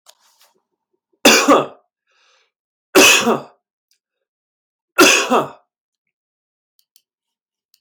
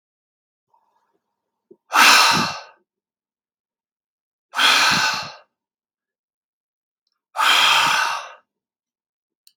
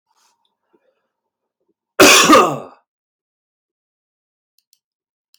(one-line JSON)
{"three_cough_length": "7.8 s", "three_cough_amplitude": 32768, "three_cough_signal_mean_std_ratio": 0.32, "exhalation_length": "9.6 s", "exhalation_amplitude": 32768, "exhalation_signal_mean_std_ratio": 0.38, "cough_length": "5.4 s", "cough_amplitude": 32767, "cough_signal_mean_std_ratio": 0.27, "survey_phase": "beta (2021-08-13 to 2022-03-07)", "age": "18-44", "gender": "Male", "wearing_mask": "No", "symptom_none": true, "smoker_status": "Never smoked", "respiratory_condition_asthma": false, "respiratory_condition_other": false, "recruitment_source": "REACT", "submission_delay": "2 days", "covid_test_result": "Negative", "covid_test_method": "RT-qPCR", "influenza_a_test_result": "Negative", "influenza_b_test_result": "Negative"}